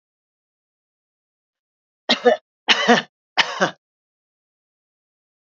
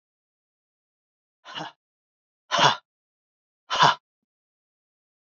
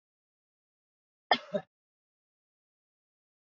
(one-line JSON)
{"three_cough_length": "5.5 s", "three_cough_amplitude": 29109, "three_cough_signal_mean_std_ratio": 0.26, "exhalation_length": "5.4 s", "exhalation_amplitude": 24736, "exhalation_signal_mean_std_ratio": 0.23, "cough_length": "3.6 s", "cough_amplitude": 10553, "cough_signal_mean_std_ratio": 0.13, "survey_phase": "beta (2021-08-13 to 2022-03-07)", "age": "45-64", "gender": "Female", "wearing_mask": "No", "symptom_runny_or_blocked_nose": true, "symptom_shortness_of_breath": true, "symptom_onset": "6 days", "smoker_status": "Never smoked", "respiratory_condition_asthma": false, "respiratory_condition_other": false, "recruitment_source": "Test and Trace", "submission_delay": "2 days", "covid_test_result": "Positive", "covid_test_method": "ePCR"}